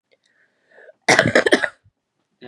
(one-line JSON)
{"cough_length": "2.5 s", "cough_amplitude": 32768, "cough_signal_mean_std_ratio": 0.32, "survey_phase": "beta (2021-08-13 to 2022-03-07)", "age": "18-44", "gender": "Female", "wearing_mask": "No", "symptom_cough_any": true, "symptom_runny_or_blocked_nose": true, "symptom_fatigue": true, "symptom_headache": true, "symptom_onset": "3 days", "smoker_status": "Never smoked", "recruitment_source": "Test and Trace", "submission_delay": "2 days", "covid_test_result": "Positive", "covid_test_method": "RT-qPCR", "covid_ct_value": 30.1, "covid_ct_gene": "ORF1ab gene"}